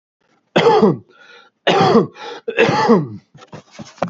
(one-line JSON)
{"three_cough_length": "4.1 s", "three_cough_amplitude": 28314, "three_cough_signal_mean_std_ratio": 0.53, "survey_phase": "beta (2021-08-13 to 2022-03-07)", "age": "45-64", "gender": "Male", "wearing_mask": "Yes", "symptom_cough_any": true, "symptom_runny_or_blocked_nose": true, "symptom_shortness_of_breath": true, "symptom_sore_throat": true, "symptom_abdominal_pain": true, "symptom_headache": true, "symptom_onset": "7 days", "smoker_status": "Ex-smoker", "respiratory_condition_asthma": false, "respiratory_condition_other": false, "recruitment_source": "Test and Trace", "submission_delay": "2 days", "covid_test_result": "Positive", "covid_test_method": "RT-qPCR", "covid_ct_value": 24.6, "covid_ct_gene": "N gene"}